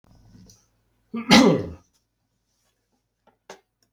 {"cough_length": "3.9 s", "cough_amplitude": 32768, "cough_signal_mean_std_ratio": 0.25, "survey_phase": "beta (2021-08-13 to 2022-03-07)", "age": "45-64", "gender": "Male", "wearing_mask": "No", "symptom_cough_any": true, "symptom_new_continuous_cough": true, "symptom_runny_or_blocked_nose": true, "symptom_fatigue": true, "symptom_headache": true, "symptom_change_to_sense_of_smell_or_taste": true, "smoker_status": "Never smoked", "respiratory_condition_asthma": false, "respiratory_condition_other": false, "recruitment_source": "Test and Trace", "submission_delay": "0 days", "covid_test_result": "Positive", "covid_test_method": "LFT"}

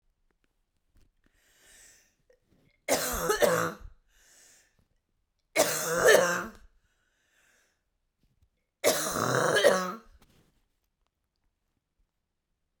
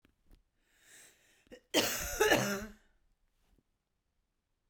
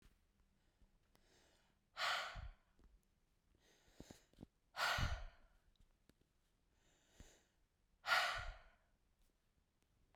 {"three_cough_length": "12.8 s", "three_cough_amplitude": 19507, "three_cough_signal_mean_std_ratio": 0.35, "cough_length": "4.7 s", "cough_amplitude": 6463, "cough_signal_mean_std_ratio": 0.33, "exhalation_length": "10.2 s", "exhalation_amplitude": 2219, "exhalation_signal_mean_std_ratio": 0.32, "survey_phase": "beta (2021-08-13 to 2022-03-07)", "age": "45-64", "gender": "Female", "wearing_mask": "No", "symptom_cough_any": true, "symptom_runny_or_blocked_nose": true, "symptom_sore_throat": true, "symptom_fatigue": true, "symptom_fever_high_temperature": true, "symptom_headache": true, "symptom_change_to_sense_of_smell_or_taste": true, "symptom_loss_of_taste": true, "symptom_other": true, "smoker_status": "Ex-smoker", "respiratory_condition_asthma": false, "respiratory_condition_other": false, "recruitment_source": "Test and Trace", "submission_delay": "1 day", "covid_test_result": "Positive", "covid_test_method": "RT-qPCR", "covid_ct_value": 22.2, "covid_ct_gene": "ORF1ab gene", "covid_ct_mean": 22.9, "covid_viral_load": "30000 copies/ml", "covid_viral_load_category": "Low viral load (10K-1M copies/ml)"}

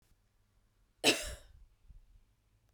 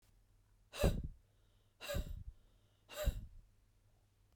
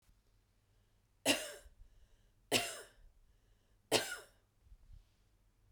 {"cough_length": "2.7 s", "cough_amplitude": 9328, "cough_signal_mean_std_ratio": 0.24, "exhalation_length": "4.4 s", "exhalation_amplitude": 3923, "exhalation_signal_mean_std_ratio": 0.37, "three_cough_length": "5.7 s", "three_cough_amplitude": 5891, "three_cough_signal_mean_std_ratio": 0.28, "survey_phase": "beta (2021-08-13 to 2022-03-07)", "age": "18-44", "gender": "Female", "wearing_mask": "No", "symptom_cough_any": true, "smoker_status": "Ex-smoker", "respiratory_condition_asthma": true, "respiratory_condition_other": false, "recruitment_source": "REACT", "submission_delay": "1 day", "covid_test_result": "Negative", "covid_test_method": "RT-qPCR", "influenza_a_test_result": "Unknown/Void", "influenza_b_test_result": "Unknown/Void"}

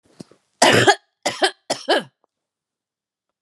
{"cough_length": "3.4 s", "cough_amplitude": 31536, "cough_signal_mean_std_ratio": 0.34, "survey_phase": "alpha (2021-03-01 to 2021-08-12)", "age": "65+", "gender": "Female", "wearing_mask": "No", "symptom_none": true, "smoker_status": "Never smoked", "respiratory_condition_asthma": false, "respiratory_condition_other": false, "recruitment_source": "REACT", "submission_delay": "1 day", "covid_test_result": "Negative", "covid_test_method": "RT-qPCR"}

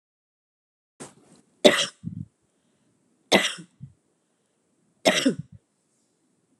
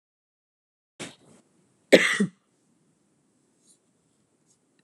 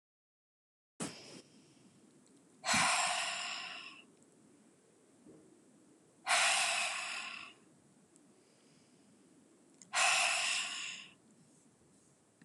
{"three_cough_length": "6.6 s", "three_cough_amplitude": 32658, "three_cough_signal_mean_std_ratio": 0.24, "cough_length": "4.8 s", "cough_amplitude": 31649, "cough_signal_mean_std_ratio": 0.18, "exhalation_length": "12.4 s", "exhalation_amplitude": 4939, "exhalation_signal_mean_std_ratio": 0.44, "survey_phase": "beta (2021-08-13 to 2022-03-07)", "age": "45-64", "gender": "Female", "wearing_mask": "No", "symptom_none": true, "smoker_status": "Never smoked", "respiratory_condition_asthma": false, "respiratory_condition_other": false, "recruitment_source": "Test and Trace", "submission_delay": "1 day", "covid_test_result": "Negative", "covid_test_method": "RT-qPCR"}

